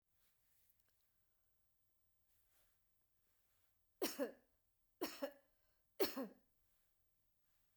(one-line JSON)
{"three_cough_length": "7.8 s", "three_cough_amplitude": 2618, "three_cough_signal_mean_std_ratio": 0.25, "survey_phase": "beta (2021-08-13 to 2022-03-07)", "age": "45-64", "gender": "Female", "wearing_mask": "No", "symptom_none": true, "smoker_status": "Never smoked", "respiratory_condition_asthma": false, "respiratory_condition_other": false, "recruitment_source": "REACT", "submission_delay": "2 days", "covid_test_result": "Negative", "covid_test_method": "RT-qPCR"}